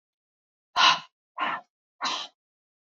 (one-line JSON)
{"exhalation_length": "3.0 s", "exhalation_amplitude": 17469, "exhalation_signal_mean_std_ratio": 0.32, "survey_phase": "beta (2021-08-13 to 2022-03-07)", "age": "18-44", "gender": "Female", "wearing_mask": "No", "symptom_none": true, "smoker_status": "Current smoker (1 to 10 cigarettes per day)", "respiratory_condition_asthma": true, "respiratory_condition_other": false, "recruitment_source": "Test and Trace", "submission_delay": "2 days", "covid_test_result": "Negative", "covid_test_method": "ePCR"}